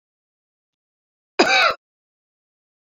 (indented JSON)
{
  "cough_length": "2.9 s",
  "cough_amplitude": 27580,
  "cough_signal_mean_std_ratio": 0.27,
  "survey_phase": "beta (2021-08-13 to 2022-03-07)",
  "age": "18-44",
  "gender": "Female",
  "wearing_mask": "No",
  "symptom_none": true,
  "smoker_status": "Ex-smoker",
  "respiratory_condition_asthma": false,
  "respiratory_condition_other": false,
  "recruitment_source": "REACT",
  "submission_delay": "1 day",
  "covid_test_result": "Negative",
  "covid_test_method": "RT-qPCR",
  "influenza_a_test_result": "Negative",
  "influenza_b_test_result": "Negative"
}